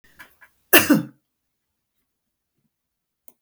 {"cough_length": "3.4 s", "cough_amplitude": 32768, "cough_signal_mean_std_ratio": 0.21, "survey_phase": "beta (2021-08-13 to 2022-03-07)", "age": "65+", "gender": "Female", "wearing_mask": "No", "symptom_none": true, "symptom_onset": "12 days", "smoker_status": "Never smoked", "respiratory_condition_asthma": false, "respiratory_condition_other": false, "recruitment_source": "REACT", "submission_delay": "1 day", "covid_test_result": "Negative", "covid_test_method": "RT-qPCR", "influenza_a_test_result": "Unknown/Void", "influenza_b_test_result": "Unknown/Void"}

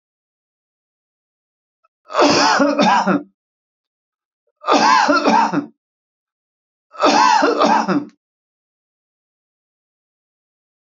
{"three_cough_length": "10.8 s", "three_cough_amplitude": 28450, "three_cough_signal_mean_std_ratio": 0.44, "survey_phase": "beta (2021-08-13 to 2022-03-07)", "age": "45-64", "gender": "Male", "wearing_mask": "No", "symptom_none": true, "smoker_status": "Never smoked", "respiratory_condition_asthma": false, "respiratory_condition_other": false, "recruitment_source": "REACT", "submission_delay": "1 day", "covid_test_result": "Negative", "covid_test_method": "RT-qPCR", "influenza_a_test_result": "Negative", "influenza_b_test_result": "Negative"}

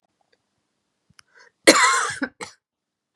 {"cough_length": "3.2 s", "cough_amplitude": 32768, "cough_signal_mean_std_ratio": 0.29, "survey_phase": "beta (2021-08-13 to 2022-03-07)", "age": "18-44", "gender": "Female", "wearing_mask": "No", "symptom_cough_any": true, "symptom_new_continuous_cough": true, "symptom_runny_or_blocked_nose": true, "symptom_shortness_of_breath": true, "symptom_diarrhoea": true, "symptom_fatigue": true, "symptom_headache": true, "symptom_onset": "3 days", "smoker_status": "Ex-smoker", "respiratory_condition_asthma": false, "respiratory_condition_other": false, "recruitment_source": "Test and Trace", "submission_delay": "2 days", "covid_test_result": "Positive", "covid_test_method": "RT-qPCR", "covid_ct_value": 21.9, "covid_ct_gene": "ORF1ab gene", "covid_ct_mean": 22.0, "covid_viral_load": "60000 copies/ml", "covid_viral_load_category": "Low viral load (10K-1M copies/ml)"}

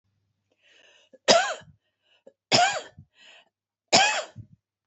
{"three_cough_length": "4.9 s", "three_cough_amplitude": 26527, "three_cough_signal_mean_std_ratio": 0.32, "survey_phase": "beta (2021-08-13 to 2022-03-07)", "age": "65+", "gender": "Female", "wearing_mask": "No", "symptom_cough_any": true, "symptom_headache": true, "symptom_onset": "6 days", "smoker_status": "Ex-smoker", "respiratory_condition_asthma": false, "respiratory_condition_other": false, "recruitment_source": "REACT", "submission_delay": "1 day", "covid_test_result": "Negative", "covid_test_method": "RT-qPCR", "influenza_a_test_result": "Negative", "influenza_b_test_result": "Negative"}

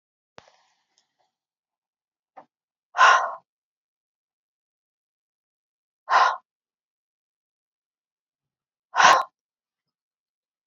{"exhalation_length": "10.7 s", "exhalation_amplitude": 27155, "exhalation_signal_mean_std_ratio": 0.21, "survey_phase": "alpha (2021-03-01 to 2021-08-12)", "age": "18-44", "gender": "Female", "wearing_mask": "No", "symptom_new_continuous_cough": true, "symptom_shortness_of_breath": true, "symptom_fatigue": true, "symptom_change_to_sense_of_smell_or_taste": true, "symptom_loss_of_taste": true, "symptom_onset": "6 days", "smoker_status": "Never smoked", "respiratory_condition_asthma": false, "respiratory_condition_other": false, "recruitment_source": "Test and Trace", "submission_delay": "3 days", "covid_test_result": "Positive", "covid_test_method": "RT-qPCR", "covid_ct_value": 14.7, "covid_ct_gene": "ORF1ab gene", "covid_ct_mean": 14.8, "covid_viral_load": "14000000 copies/ml", "covid_viral_load_category": "High viral load (>1M copies/ml)"}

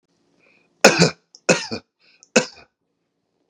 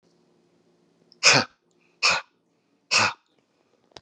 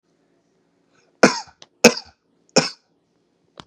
{"three_cough_length": "3.5 s", "three_cough_amplitude": 32768, "three_cough_signal_mean_std_ratio": 0.27, "exhalation_length": "4.0 s", "exhalation_amplitude": 28641, "exhalation_signal_mean_std_ratio": 0.3, "cough_length": "3.7 s", "cough_amplitude": 32768, "cough_signal_mean_std_ratio": 0.21, "survey_phase": "beta (2021-08-13 to 2022-03-07)", "age": "45-64", "gender": "Male", "wearing_mask": "No", "symptom_none": true, "symptom_onset": "8 days", "smoker_status": "Never smoked", "respiratory_condition_asthma": false, "respiratory_condition_other": false, "recruitment_source": "REACT", "submission_delay": "1 day", "covid_test_result": "Negative", "covid_test_method": "RT-qPCR"}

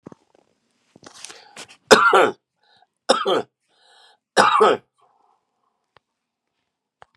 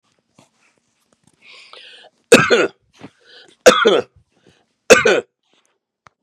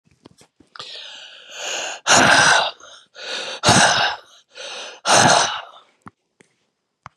{"three_cough_length": "7.2 s", "three_cough_amplitude": 32768, "three_cough_signal_mean_std_ratio": 0.3, "cough_length": "6.2 s", "cough_amplitude": 32768, "cough_signal_mean_std_ratio": 0.3, "exhalation_length": "7.2 s", "exhalation_amplitude": 32767, "exhalation_signal_mean_std_ratio": 0.46, "survey_phase": "beta (2021-08-13 to 2022-03-07)", "age": "65+", "gender": "Male", "wearing_mask": "No", "symptom_none": true, "smoker_status": "Ex-smoker", "respiratory_condition_asthma": false, "respiratory_condition_other": false, "recruitment_source": "REACT", "submission_delay": "3 days", "covid_test_result": "Negative", "covid_test_method": "RT-qPCR", "influenza_a_test_result": "Negative", "influenza_b_test_result": "Negative"}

